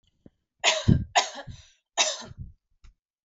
{
  "three_cough_length": "3.2 s",
  "three_cough_amplitude": 16946,
  "three_cough_signal_mean_std_ratio": 0.36,
  "survey_phase": "alpha (2021-03-01 to 2021-08-12)",
  "age": "18-44",
  "gender": "Female",
  "wearing_mask": "No",
  "symptom_none": true,
  "smoker_status": "Never smoked",
  "respiratory_condition_asthma": false,
  "respiratory_condition_other": false,
  "recruitment_source": "Test and Trace",
  "submission_delay": "0 days",
  "covid_test_result": "Negative",
  "covid_test_method": "LFT"
}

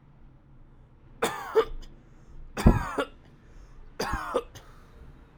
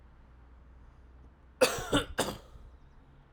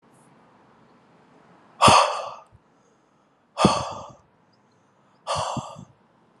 {
  "three_cough_length": "5.4 s",
  "three_cough_amplitude": 17622,
  "three_cough_signal_mean_std_ratio": 0.38,
  "cough_length": "3.3 s",
  "cough_amplitude": 10614,
  "cough_signal_mean_std_ratio": 0.36,
  "exhalation_length": "6.4 s",
  "exhalation_amplitude": 29995,
  "exhalation_signal_mean_std_ratio": 0.3,
  "survey_phase": "alpha (2021-03-01 to 2021-08-12)",
  "age": "18-44",
  "gender": "Male",
  "wearing_mask": "No",
  "symptom_cough_any": true,
  "symptom_fatigue": true,
  "symptom_headache": true,
  "symptom_onset": "3 days",
  "smoker_status": "Never smoked",
  "respiratory_condition_asthma": false,
  "respiratory_condition_other": false,
  "recruitment_source": "Test and Trace",
  "submission_delay": "2 days",
  "covid_test_result": "Positive",
  "covid_test_method": "RT-qPCR",
  "covid_ct_value": 18.8,
  "covid_ct_gene": "ORF1ab gene",
  "covid_ct_mean": 19.3,
  "covid_viral_load": "480000 copies/ml",
  "covid_viral_load_category": "Low viral load (10K-1M copies/ml)"
}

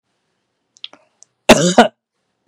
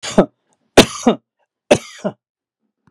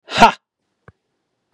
{
  "cough_length": "2.5 s",
  "cough_amplitude": 32768,
  "cough_signal_mean_std_ratio": 0.27,
  "three_cough_length": "2.9 s",
  "three_cough_amplitude": 32768,
  "three_cough_signal_mean_std_ratio": 0.27,
  "exhalation_length": "1.5 s",
  "exhalation_amplitude": 32768,
  "exhalation_signal_mean_std_ratio": 0.24,
  "survey_phase": "beta (2021-08-13 to 2022-03-07)",
  "age": "65+",
  "gender": "Male",
  "wearing_mask": "No",
  "symptom_none": true,
  "smoker_status": "Never smoked",
  "respiratory_condition_asthma": false,
  "respiratory_condition_other": false,
  "recruitment_source": "REACT",
  "submission_delay": "3 days",
  "covid_test_result": "Negative",
  "covid_test_method": "RT-qPCR",
  "influenza_a_test_result": "Negative",
  "influenza_b_test_result": "Negative"
}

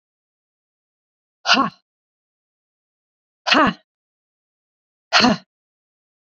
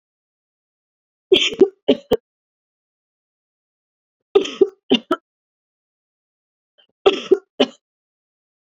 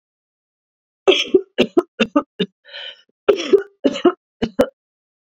{
  "exhalation_length": "6.3 s",
  "exhalation_amplitude": 31917,
  "exhalation_signal_mean_std_ratio": 0.26,
  "three_cough_length": "8.7 s",
  "three_cough_amplitude": 30237,
  "three_cough_signal_mean_std_ratio": 0.24,
  "cough_length": "5.4 s",
  "cough_amplitude": 28507,
  "cough_signal_mean_std_ratio": 0.34,
  "survey_phase": "beta (2021-08-13 to 2022-03-07)",
  "age": "18-44",
  "gender": "Female",
  "wearing_mask": "No",
  "symptom_cough_any": true,
  "symptom_runny_or_blocked_nose": true,
  "symptom_fatigue": true,
  "symptom_headache": true,
  "symptom_change_to_sense_of_smell_or_taste": true,
  "symptom_onset": "3 days",
  "smoker_status": "Never smoked",
  "respiratory_condition_asthma": false,
  "respiratory_condition_other": false,
  "recruitment_source": "Test and Trace",
  "submission_delay": "2 days",
  "covid_test_result": "Positive",
  "covid_test_method": "RT-qPCR",
  "covid_ct_value": 18.0,
  "covid_ct_gene": "ORF1ab gene",
  "covid_ct_mean": 18.4,
  "covid_viral_load": "930000 copies/ml",
  "covid_viral_load_category": "Low viral load (10K-1M copies/ml)"
}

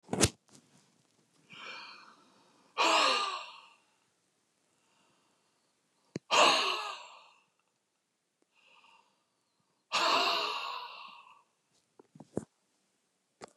{
  "exhalation_length": "13.6 s",
  "exhalation_amplitude": 11718,
  "exhalation_signal_mean_std_ratio": 0.34,
  "survey_phase": "beta (2021-08-13 to 2022-03-07)",
  "age": "65+",
  "gender": "Male",
  "wearing_mask": "No",
  "symptom_cough_any": true,
  "symptom_onset": "2 days",
  "smoker_status": "Never smoked",
  "respiratory_condition_asthma": false,
  "respiratory_condition_other": false,
  "recruitment_source": "Test and Trace",
  "submission_delay": "1 day",
  "covid_test_result": "Positive",
  "covid_test_method": "RT-qPCR",
  "covid_ct_value": 18.1,
  "covid_ct_gene": "ORF1ab gene",
  "covid_ct_mean": 18.5,
  "covid_viral_load": "880000 copies/ml",
  "covid_viral_load_category": "Low viral load (10K-1M copies/ml)"
}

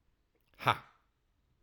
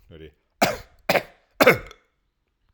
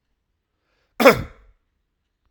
{
  "exhalation_length": "1.6 s",
  "exhalation_amplitude": 9725,
  "exhalation_signal_mean_std_ratio": 0.19,
  "three_cough_length": "2.7 s",
  "three_cough_amplitude": 30847,
  "three_cough_signal_mean_std_ratio": 0.29,
  "cough_length": "2.3 s",
  "cough_amplitude": 32768,
  "cough_signal_mean_std_ratio": 0.21,
  "survey_phase": "alpha (2021-03-01 to 2021-08-12)",
  "age": "18-44",
  "gender": "Male",
  "wearing_mask": "No",
  "symptom_none": true,
  "smoker_status": "Ex-smoker",
  "respiratory_condition_asthma": false,
  "respiratory_condition_other": false,
  "recruitment_source": "REACT",
  "submission_delay": "1 day",
  "covid_test_result": "Negative",
  "covid_test_method": "RT-qPCR"
}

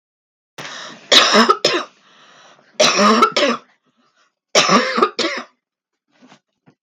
{
  "three_cough_length": "6.8 s",
  "three_cough_amplitude": 32768,
  "three_cough_signal_mean_std_ratio": 0.45,
  "survey_phase": "beta (2021-08-13 to 2022-03-07)",
  "age": "45-64",
  "gender": "Female",
  "wearing_mask": "No",
  "symptom_none": true,
  "smoker_status": "Never smoked",
  "respiratory_condition_asthma": false,
  "respiratory_condition_other": false,
  "recruitment_source": "REACT",
  "submission_delay": "7 days",
  "covid_test_result": "Negative",
  "covid_test_method": "RT-qPCR",
  "influenza_a_test_result": "Negative",
  "influenza_b_test_result": "Negative"
}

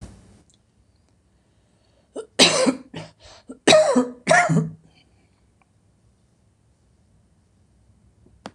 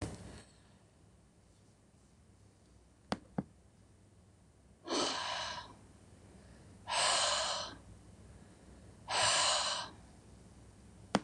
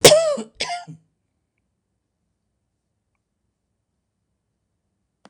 {
  "three_cough_length": "8.5 s",
  "three_cough_amplitude": 26027,
  "three_cough_signal_mean_std_ratio": 0.31,
  "exhalation_length": "11.2 s",
  "exhalation_amplitude": 9093,
  "exhalation_signal_mean_std_ratio": 0.45,
  "cough_length": "5.3 s",
  "cough_amplitude": 26028,
  "cough_signal_mean_std_ratio": 0.21,
  "survey_phase": "beta (2021-08-13 to 2022-03-07)",
  "age": "65+",
  "gender": "Female",
  "wearing_mask": "No",
  "symptom_none": true,
  "smoker_status": "Never smoked",
  "respiratory_condition_asthma": false,
  "respiratory_condition_other": false,
  "recruitment_source": "REACT",
  "submission_delay": "2 days",
  "covid_test_result": "Negative",
  "covid_test_method": "RT-qPCR",
  "influenza_a_test_result": "Negative",
  "influenza_b_test_result": "Negative"
}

